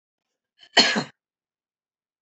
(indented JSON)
{
  "three_cough_length": "2.2 s",
  "three_cough_amplitude": 25615,
  "three_cough_signal_mean_std_ratio": 0.24,
  "survey_phase": "beta (2021-08-13 to 2022-03-07)",
  "age": "65+",
  "gender": "Female",
  "wearing_mask": "No",
  "symptom_cough_any": true,
  "smoker_status": "Never smoked",
  "respiratory_condition_asthma": true,
  "respiratory_condition_other": false,
  "recruitment_source": "REACT",
  "submission_delay": "2 days",
  "covid_test_result": "Negative",
  "covid_test_method": "RT-qPCR",
  "influenza_a_test_result": "Negative",
  "influenza_b_test_result": "Negative"
}